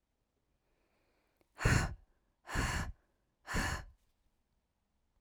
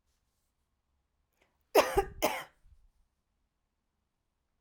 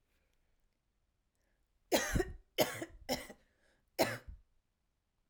{"exhalation_length": "5.2 s", "exhalation_amplitude": 5215, "exhalation_signal_mean_std_ratio": 0.35, "cough_length": "4.6 s", "cough_amplitude": 11555, "cough_signal_mean_std_ratio": 0.22, "three_cough_length": "5.3 s", "three_cough_amplitude": 4792, "three_cough_signal_mean_std_ratio": 0.32, "survey_phase": "alpha (2021-03-01 to 2021-08-12)", "age": "18-44", "gender": "Female", "wearing_mask": "No", "symptom_none": true, "smoker_status": "Never smoked", "respiratory_condition_asthma": false, "respiratory_condition_other": false, "recruitment_source": "REACT", "submission_delay": "2 days", "covid_test_result": "Negative", "covid_test_method": "RT-qPCR"}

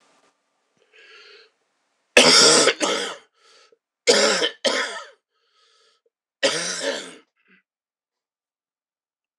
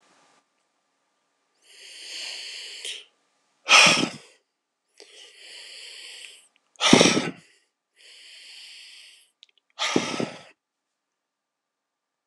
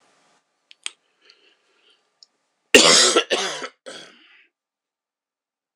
{"three_cough_length": "9.4 s", "three_cough_amplitude": 26028, "three_cough_signal_mean_std_ratio": 0.35, "exhalation_length": "12.3 s", "exhalation_amplitude": 26028, "exhalation_signal_mean_std_ratio": 0.27, "cough_length": "5.8 s", "cough_amplitude": 26028, "cough_signal_mean_std_ratio": 0.27, "survey_phase": "beta (2021-08-13 to 2022-03-07)", "age": "45-64", "gender": "Male", "wearing_mask": "No", "symptom_cough_any": true, "symptom_runny_or_blocked_nose": true, "symptom_fatigue": true, "symptom_headache": true, "symptom_onset": "8 days", "smoker_status": "Never smoked", "respiratory_condition_asthma": false, "respiratory_condition_other": true, "recruitment_source": "Test and Trace", "submission_delay": "1 day", "covid_test_result": "Positive", "covid_test_method": "RT-qPCR", "covid_ct_value": 18.6, "covid_ct_gene": "ORF1ab gene"}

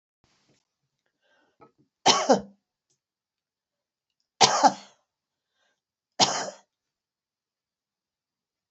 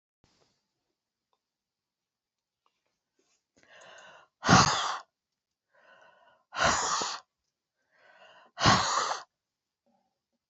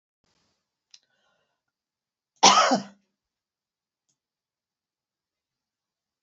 {"three_cough_length": "8.7 s", "three_cough_amplitude": 29053, "three_cough_signal_mean_std_ratio": 0.22, "exhalation_length": "10.5 s", "exhalation_amplitude": 16147, "exhalation_signal_mean_std_ratio": 0.29, "cough_length": "6.2 s", "cough_amplitude": 25598, "cough_signal_mean_std_ratio": 0.18, "survey_phase": "beta (2021-08-13 to 2022-03-07)", "age": "65+", "gender": "Female", "wearing_mask": "No", "symptom_none": true, "smoker_status": "Ex-smoker", "respiratory_condition_asthma": false, "respiratory_condition_other": false, "recruitment_source": "REACT", "submission_delay": "3 days", "covid_test_result": "Negative", "covid_test_method": "RT-qPCR"}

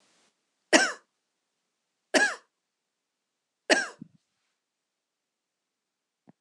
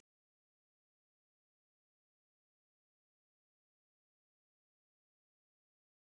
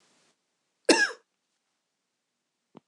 {"three_cough_length": "6.4 s", "three_cough_amplitude": 20240, "three_cough_signal_mean_std_ratio": 0.21, "exhalation_length": "6.1 s", "exhalation_amplitude": 46, "exhalation_signal_mean_std_ratio": 0.02, "cough_length": "2.9 s", "cough_amplitude": 21041, "cough_signal_mean_std_ratio": 0.2, "survey_phase": "beta (2021-08-13 to 2022-03-07)", "age": "65+", "gender": "Female", "wearing_mask": "No", "symptom_none": true, "smoker_status": "Never smoked", "respiratory_condition_asthma": false, "respiratory_condition_other": false, "recruitment_source": "REACT", "submission_delay": "2 days", "covid_test_result": "Negative", "covid_test_method": "RT-qPCR"}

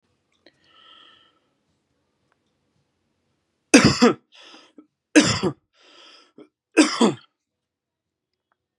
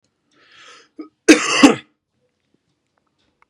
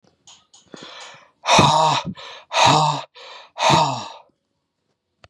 {"three_cough_length": "8.8 s", "three_cough_amplitude": 32767, "three_cough_signal_mean_std_ratio": 0.25, "cough_length": "3.5 s", "cough_amplitude": 32768, "cough_signal_mean_std_ratio": 0.25, "exhalation_length": "5.3 s", "exhalation_amplitude": 32292, "exhalation_signal_mean_std_ratio": 0.46, "survey_phase": "beta (2021-08-13 to 2022-03-07)", "age": "45-64", "gender": "Male", "wearing_mask": "No", "symptom_none": true, "symptom_onset": "12 days", "smoker_status": "Never smoked", "respiratory_condition_asthma": false, "respiratory_condition_other": false, "recruitment_source": "REACT", "submission_delay": "2 days", "covid_test_result": "Negative", "covid_test_method": "RT-qPCR", "influenza_a_test_result": "Negative", "influenza_b_test_result": "Negative"}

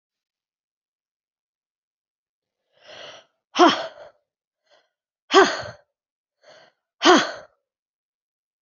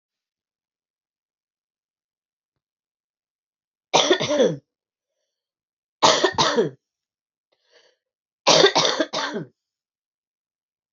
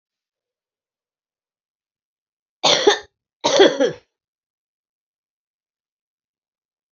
{"exhalation_length": "8.6 s", "exhalation_amplitude": 27829, "exhalation_signal_mean_std_ratio": 0.22, "three_cough_length": "10.9 s", "three_cough_amplitude": 29102, "three_cough_signal_mean_std_ratio": 0.31, "cough_length": "6.9 s", "cough_amplitude": 32323, "cough_signal_mean_std_ratio": 0.25, "survey_phase": "beta (2021-08-13 to 2022-03-07)", "age": "45-64", "gender": "Male", "wearing_mask": "No", "symptom_cough_any": true, "symptom_headache": true, "symptom_onset": "5 days", "smoker_status": "Never smoked", "respiratory_condition_asthma": false, "respiratory_condition_other": false, "recruitment_source": "Test and Trace", "submission_delay": "2 days", "covid_test_result": "Positive", "covid_test_method": "LAMP"}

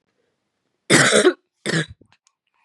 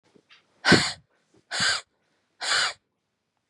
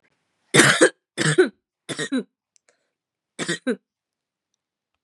{"cough_length": "2.6 s", "cough_amplitude": 32147, "cough_signal_mean_std_ratio": 0.37, "exhalation_length": "3.5 s", "exhalation_amplitude": 24537, "exhalation_signal_mean_std_ratio": 0.36, "three_cough_length": "5.0 s", "three_cough_amplitude": 32049, "three_cough_signal_mean_std_ratio": 0.33, "survey_phase": "beta (2021-08-13 to 2022-03-07)", "age": "18-44", "gender": "Female", "wearing_mask": "No", "symptom_cough_any": true, "symptom_runny_or_blocked_nose": true, "symptom_onset": "6 days", "smoker_status": "Never smoked", "respiratory_condition_asthma": false, "respiratory_condition_other": false, "recruitment_source": "REACT", "submission_delay": "1 day", "covid_test_result": "Positive", "covid_test_method": "RT-qPCR", "covid_ct_value": 20.0, "covid_ct_gene": "E gene", "influenza_a_test_result": "Negative", "influenza_b_test_result": "Negative"}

